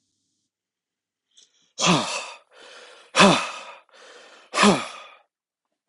{"exhalation_length": "5.9 s", "exhalation_amplitude": 29565, "exhalation_signal_mean_std_ratio": 0.33, "survey_phase": "beta (2021-08-13 to 2022-03-07)", "age": "45-64", "gender": "Male", "wearing_mask": "No", "symptom_cough_any": true, "symptom_runny_or_blocked_nose": true, "symptom_fatigue": true, "symptom_headache": true, "symptom_change_to_sense_of_smell_or_taste": true, "smoker_status": "Never smoked", "respiratory_condition_asthma": false, "respiratory_condition_other": false, "recruitment_source": "Test and Trace", "submission_delay": "2 days", "covid_test_result": "Positive", "covid_test_method": "RT-qPCR", "covid_ct_value": 26.2, "covid_ct_gene": "ORF1ab gene"}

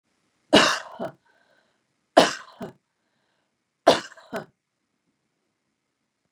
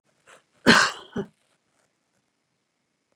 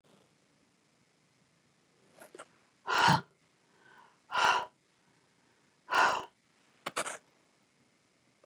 {"three_cough_length": "6.3 s", "three_cough_amplitude": 32675, "three_cough_signal_mean_std_ratio": 0.22, "cough_length": "3.2 s", "cough_amplitude": 26528, "cough_signal_mean_std_ratio": 0.23, "exhalation_length": "8.5 s", "exhalation_amplitude": 7520, "exhalation_signal_mean_std_ratio": 0.28, "survey_phase": "beta (2021-08-13 to 2022-03-07)", "age": "65+", "gender": "Female", "wearing_mask": "No", "symptom_none": true, "smoker_status": "Ex-smoker", "respiratory_condition_asthma": false, "respiratory_condition_other": false, "recruitment_source": "REACT", "submission_delay": "2 days", "covid_test_result": "Negative", "covid_test_method": "RT-qPCR", "influenza_a_test_result": "Negative", "influenza_b_test_result": "Negative"}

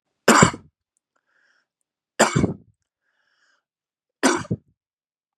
{"three_cough_length": "5.4 s", "three_cough_amplitude": 32768, "three_cough_signal_mean_std_ratio": 0.27, "survey_phase": "beta (2021-08-13 to 2022-03-07)", "age": "18-44", "gender": "Male", "wearing_mask": "No", "symptom_none": true, "smoker_status": "Ex-smoker", "respiratory_condition_asthma": false, "respiratory_condition_other": false, "recruitment_source": "REACT", "submission_delay": "1 day", "covid_test_result": "Negative", "covid_test_method": "RT-qPCR"}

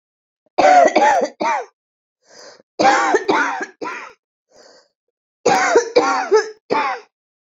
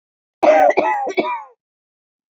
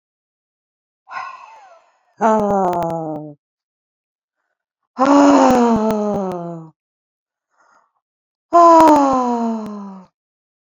{"three_cough_length": "7.4 s", "three_cough_amplitude": 31250, "three_cough_signal_mean_std_ratio": 0.52, "cough_length": "2.4 s", "cough_amplitude": 27704, "cough_signal_mean_std_ratio": 0.48, "exhalation_length": "10.7 s", "exhalation_amplitude": 30962, "exhalation_signal_mean_std_ratio": 0.45, "survey_phase": "beta (2021-08-13 to 2022-03-07)", "age": "45-64", "gender": "Female", "wearing_mask": "No", "symptom_none": true, "smoker_status": "Current smoker (1 to 10 cigarettes per day)", "respiratory_condition_asthma": false, "respiratory_condition_other": true, "recruitment_source": "REACT", "submission_delay": "6 days", "covid_test_result": "Negative", "covid_test_method": "RT-qPCR", "influenza_a_test_result": "Negative", "influenza_b_test_result": "Negative"}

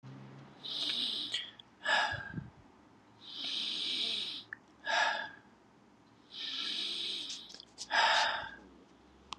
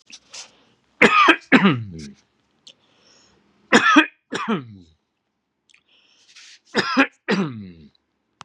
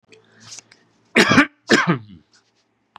{"exhalation_length": "9.4 s", "exhalation_amplitude": 5609, "exhalation_signal_mean_std_ratio": 0.6, "three_cough_length": "8.4 s", "three_cough_amplitude": 32768, "three_cough_signal_mean_std_ratio": 0.35, "cough_length": "3.0 s", "cough_amplitude": 32767, "cough_signal_mean_std_ratio": 0.34, "survey_phase": "beta (2021-08-13 to 2022-03-07)", "age": "18-44", "gender": "Male", "wearing_mask": "No", "symptom_none": true, "smoker_status": "Ex-smoker", "respiratory_condition_asthma": false, "respiratory_condition_other": false, "recruitment_source": "REACT", "submission_delay": "0 days", "covid_test_result": "Negative", "covid_test_method": "RT-qPCR", "influenza_a_test_result": "Negative", "influenza_b_test_result": "Negative"}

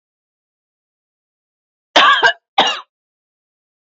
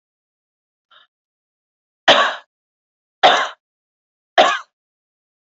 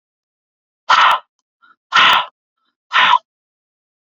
{"cough_length": "3.8 s", "cough_amplitude": 31068, "cough_signal_mean_std_ratio": 0.3, "three_cough_length": "5.5 s", "three_cough_amplitude": 28777, "three_cough_signal_mean_std_ratio": 0.27, "exhalation_length": "4.0 s", "exhalation_amplitude": 31181, "exhalation_signal_mean_std_ratio": 0.38, "survey_phase": "beta (2021-08-13 to 2022-03-07)", "age": "45-64", "gender": "Female", "wearing_mask": "No", "symptom_runny_or_blocked_nose": true, "symptom_sore_throat": true, "smoker_status": "Ex-smoker", "respiratory_condition_asthma": false, "respiratory_condition_other": false, "recruitment_source": "REACT", "submission_delay": "1 day", "covid_test_result": "Negative", "covid_test_method": "RT-qPCR"}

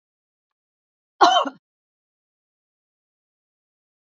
{"cough_length": "4.0 s", "cough_amplitude": 28253, "cough_signal_mean_std_ratio": 0.19, "survey_phase": "alpha (2021-03-01 to 2021-08-12)", "age": "65+", "gender": "Female", "wearing_mask": "No", "symptom_none": true, "smoker_status": "Never smoked", "respiratory_condition_asthma": false, "respiratory_condition_other": false, "recruitment_source": "REACT", "submission_delay": "1 day", "covid_test_result": "Negative", "covid_test_method": "RT-qPCR"}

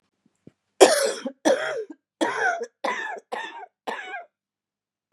{"cough_length": "5.1 s", "cough_amplitude": 32636, "cough_signal_mean_std_ratio": 0.4, "survey_phase": "beta (2021-08-13 to 2022-03-07)", "age": "45-64", "gender": "Female", "wearing_mask": "No", "symptom_cough_any": true, "symptom_new_continuous_cough": true, "symptom_runny_or_blocked_nose": true, "symptom_sore_throat": true, "symptom_fatigue": true, "symptom_fever_high_temperature": true, "symptom_headache": true, "symptom_change_to_sense_of_smell_or_taste": true, "symptom_onset": "4 days", "smoker_status": "Ex-smoker", "respiratory_condition_asthma": false, "respiratory_condition_other": false, "recruitment_source": "Test and Trace", "submission_delay": "2 days", "covid_test_result": "Positive", "covid_test_method": "RT-qPCR", "covid_ct_value": 18.3, "covid_ct_gene": "N gene", "covid_ct_mean": 19.3, "covid_viral_load": "460000 copies/ml", "covid_viral_load_category": "Low viral load (10K-1M copies/ml)"}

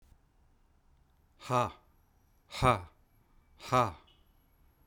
{"exhalation_length": "4.9 s", "exhalation_amplitude": 8880, "exhalation_signal_mean_std_ratio": 0.29, "survey_phase": "beta (2021-08-13 to 2022-03-07)", "age": "45-64", "gender": "Male", "wearing_mask": "No", "symptom_none": true, "smoker_status": "Never smoked", "respiratory_condition_asthma": false, "respiratory_condition_other": false, "recruitment_source": "REACT", "submission_delay": "1 day", "covid_test_result": "Negative", "covid_test_method": "RT-qPCR"}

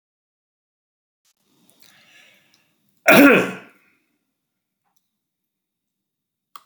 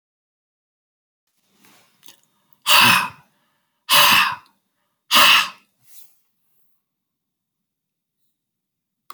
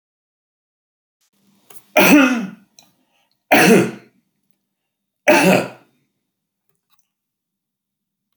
{"cough_length": "6.7 s", "cough_amplitude": 32767, "cough_signal_mean_std_ratio": 0.2, "exhalation_length": "9.1 s", "exhalation_amplitude": 29932, "exhalation_signal_mean_std_ratio": 0.29, "three_cough_length": "8.4 s", "three_cough_amplitude": 32767, "three_cough_signal_mean_std_ratio": 0.31, "survey_phase": "beta (2021-08-13 to 2022-03-07)", "age": "65+", "gender": "Male", "wearing_mask": "No", "symptom_none": true, "smoker_status": "Ex-smoker", "respiratory_condition_asthma": false, "respiratory_condition_other": false, "recruitment_source": "REACT", "submission_delay": "2 days", "covid_test_result": "Negative", "covid_test_method": "RT-qPCR"}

